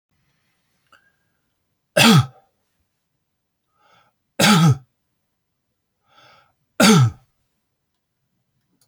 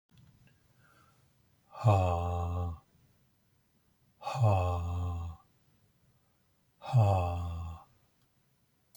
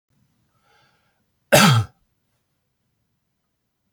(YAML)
three_cough_length: 8.9 s
three_cough_amplitude: 32768
three_cough_signal_mean_std_ratio: 0.28
exhalation_length: 9.0 s
exhalation_amplitude: 8478
exhalation_signal_mean_std_ratio: 0.47
cough_length: 3.9 s
cough_amplitude: 31060
cough_signal_mean_std_ratio: 0.24
survey_phase: beta (2021-08-13 to 2022-03-07)
age: 65+
gender: Male
wearing_mask: 'No'
symptom_none: true
smoker_status: Never smoked
respiratory_condition_asthma: false
respiratory_condition_other: false
recruitment_source: REACT
submission_delay: 1 day
covid_test_result: Negative
covid_test_method: RT-qPCR
influenza_a_test_result: Negative
influenza_b_test_result: Negative